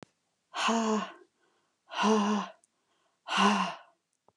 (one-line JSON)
{"exhalation_length": "4.4 s", "exhalation_amplitude": 9976, "exhalation_signal_mean_std_ratio": 0.5, "survey_phase": "beta (2021-08-13 to 2022-03-07)", "age": "45-64", "gender": "Female", "wearing_mask": "No", "symptom_none": true, "smoker_status": "Current smoker (e-cigarettes or vapes only)", "respiratory_condition_asthma": false, "respiratory_condition_other": false, "recruitment_source": "REACT", "submission_delay": "2 days", "covid_test_result": "Negative", "covid_test_method": "RT-qPCR"}